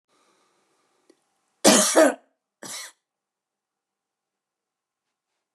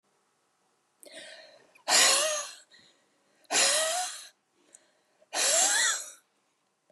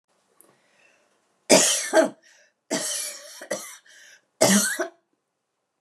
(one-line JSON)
{"cough_length": "5.5 s", "cough_amplitude": 28677, "cough_signal_mean_std_ratio": 0.23, "exhalation_length": "6.9 s", "exhalation_amplitude": 13522, "exhalation_signal_mean_std_ratio": 0.44, "three_cough_length": "5.8 s", "three_cough_amplitude": 30967, "three_cough_signal_mean_std_ratio": 0.37, "survey_phase": "beta (2021-08-13 to 2022-03-07)", "age": "65+", "gender": "Female", "wearing_mask": "No", "symptom_none": true, "smoker_status": "Ex-smoker", "respiratory_condition_asthma": true, "respiratory_condition_other": false, "recruitment_source": "REACT", "submission_delay": "1 day", "covid_test_result": "Negative", "covid_test_method": "RT-qPCR", "influenza_a_test_result": "Negative", "influenza_b_test_result": "Negative"}